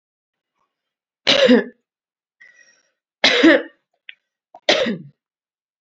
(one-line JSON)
{"three_cough_length": "5.8 s", "three_cough_amplitude": 30527, "three_cough_signal_mean_std_ratio": 0.32, "survey_phase": "beta (2021-08-13 to 2022-03-07)", "age": "18-44", "gender": "Female", "wearing_mask": "No", "symptom_none": true, "smoker_status": "Ex-smoker", "respiratory_condition_asthma": false, "respiratory_condition_other": false, "recruitment_source": "REACT", "submission_delay": "1 day", "covid_test_result": "Negative", "covid_test_method": "RT-qPCR", "influenza_a_test_result": "Negative", "influenza_b_test_result": "Negative"}